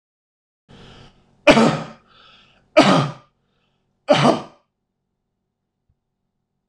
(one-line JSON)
{"three_cough_length": "6.7 s", "three_cough_amplitude": 26028, "three_cough_signal_mean_std_ratio": 0.29, "survey_phase": "alpha (2021-03-01 to 2021-08-12)", "age": "45-64", "gender": "Male", "wearing_mask": "No", "symptom_none": true, "smoker_status": "Ex-smoker", "respiratory_condition_asthma": false, "respiratory_condition_other": false, "recruitment_source": "REACT", "submission_delay": "1 day", "covid_test_result": "Negative", "covid_test_method": "RT-qPCR"}